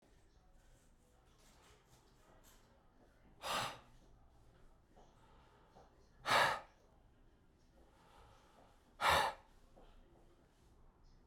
{
  "exhalation_length": "11.3 s",
  "exhalation_amplitude": 3754,
  "exhalation_signal_mean_std_ratio": 0.28,
  "survey_phase": "beta (2021-08-13 to 2022-03-07)",
  "age": "18-44",
  "gender": "Male",
  "wearing_mask": "Yes",
  "symptom_runny_or_blocked_nose": true,
  "symptom_onset": "2 days",
  "smoker_status": "Ex-smoker",
  "respiratory_condition_asthma": false,
  "respiratory_condition_other": false,
  "recruitment_source": "Test and Trace",
  "submission_delay": "1 day",
  "covid_test_result": "Positive",
  "covid_test_method": "RT-qPCR"
}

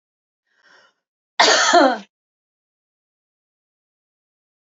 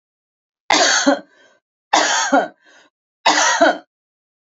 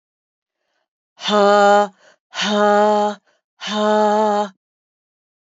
{
  "cough_length": "4.6 s",
  "cough_amplitude": 28697,
  "cough_signal_mean_std_ratio": 0.28,
  "three_cough_length": "4.4 s",
  "three_cough_amplitude": 32768,
  "three_cough_signal_mean_std_ratio": 0.48,
  "exhalation_length": "5.5 s",
  "exhalation_amplitude": 27924,
  "exhalation_signal_mean_std_ratio": 0.51,
  "survey_phase": "beta (2021-08-13 to 2022-03-07)",
  "age": "45-64",
  "gender": "Female",
  "wearing_mask": "No",
  "symptom_cough_any": true,
  "symptom_runny_or_blocked_nose": true,
  "symptom_other": true,
  "smoker_status": "Never smoked",
  "respiratory_condition_asthma": false,
  "respiratory_condition_other": false,
  "recruitment_source": "Test and Trace",
  "submission_delay": "2 days",
  "covid_test_result": "Positive",
  "covid_test_method": "RT-qPCR",
  "covid_ct_value": 27.4,
  "covid_ct_gene": "ORF1ab gene",
  "covid_ct_mean": 28.0,
  "covid_viral_load": "660 copies/ml",
  "covid_viral_load_category": "Minimal viral load (< 10K copies/ml)"
}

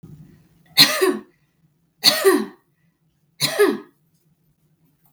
{
  "three_cough_length": "5.1 s",
  "three_cough_amplitude": 32768,
  "three_cough_signal_mean_std_ratio": 0.35,
  "survey_phase": "beta (2021-08-13 to 2022-03-07)",
  "age": "18-44",
  "gender": "Female",
  "wearing_mask": "No",
  "symptom_none": true,
  "smoker_status": "Never smoked",
  "respiratory_condition_asthma": false,
  "respiratory_condition_other": false,
  "recruitment_source": "Test and Trace",
  "submission_delay": "1 day",
  "covid_test_result": "Negative",
  "covid_test_method": "RT-qPCR"
}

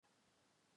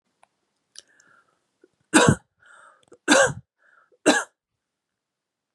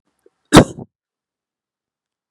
{
  "exhalation_length": "0.8 s",
  "exhalation_amplitude": 32,
  "exhalation_signal_mean_std_ratio": 1.1,
  "three_cough_length": "5.5 s",
  "three_cough_amplitude": 28359,
  "three_cough_signal_mean_std_ratio": 0.26,
  "cough_length": "2.3 s",
  "cough_amplitude": 32768,
  "cough_signal_mean_std_ratio": 0.19,
  "survey_phase": "beta (2021-08-13 to 2022-03-07)",
  "age": "18-44",
  "gender": "Female",
  "wearing_mask": "No",
  "symptom_runny_or_blocked_nose": true,
  "symptom_headache": true,
  "symptom_onset": "2 days",
  "smoker_status": "Ex-smoker",
  "respiratory_condition_asthma": false,
  "respiratory_condition_other": false,
  "recruitment_source": "Test and Trace",
  "submission_delay": "1 day",
  "covid_test_result": "Positive",
  "covid_test_method": "RT-qPCR",
  "covid_ct_value": 27.1,
  "covid_ct_gene": "ORF1ab gene",
  "covid_ct_mean": 27.3,
  "covid_viral_load": "1100 copies/ml",
  "covid_viral_load_category": "Minimal viral load (< 10K copies/ml)"
}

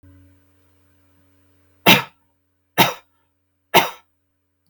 {
  "three_cough_length": "4.7 s",
  "three_cough_amplitude": 32768,
  "three_cough_signal_mean_std_ratio": 0.23,
  "survey_phase": "beta (2021-08-13 to 2022-03-07)",
  "age": "45-64",
  "gender": "Male",
  "wearing_mask": "No",
  "symptom_none": true,
  "smoker_status": "Never smoked",
  "respiratory_condition_asthma": false,
  "respiratory_condition_other": false,
  "recruitment_source": "REACT",
  "submission_delay": "1 day",
  "covid_test_result": "Negative",
  "covid_test_method": "RT-qPCR"
}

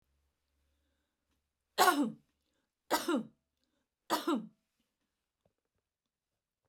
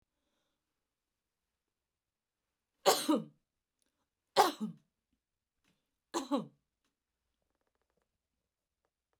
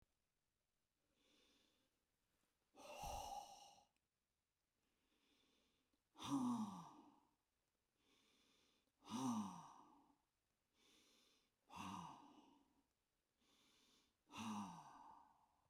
{
  "three_cough_length": "6.7 s",
  "three_cough_amplitude": 8063,
  "three_cough_signal_mean_std_ratio": 0.27,
  "cough_length": "9.2 s",
  "cough_amplitude": 9540,
  "cough_signal_mean_std_ratio": 0.2,
  "exhalation_length": "15.7 s",
  "exhalation_amplitude": 681,
  "exhalation_signal_mean_std_ratio": 0.37,
  "survey_phase": "beta (2021-08-13 to 2022-03-07)",
  "age": "65+",
  "gender": "Female",
  "wearing_mask": "No",
  "symptom_cough_any": true,
  "smoker_status": "Never smoked",
  "respiratory_condition_asthma": false,
  "respiratory_condition_other": false,
  "recruitment_source": "REACT",
  "submission_delay": "2 days",
  "covid_test_result": "Negative",
  "covid_test_method": "RT-qPCR",
  "influenza_a_test_result": "Negative",
  "influenza_b_test_result": "Negative"
}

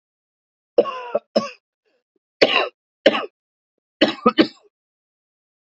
{
  "three_cough_length": "5.6 s",
  "three_cough_amplitude": 31936,
  "three_cough_signal_mean_std_ratio": 0.29,
  "survey_phase": "beta (2021-08-13 to 2022-03-07)",
  "age": "18-44",
  "gender": "Male",
  "wearing_mask": "No",
  "symptom_cough_any": true,
  "symptom_new_continuous_cough": true,
  "symptom_runny_or_blocked_nose": true,
  "symptom_shortness_of_breath": true,
  "symptom_sore_throat": true,
  "symptom_other": true,
  "smoker_status": "Never smoked",
  "respiratory_condition_asthma": true,
  "respiratory_condition_other": false,
  "recruitment_source": "Test and Trace",
  "submission_delay": "2 days",
  "covid_test_result": "Positive",
  "covid_test_method": "LFT"
}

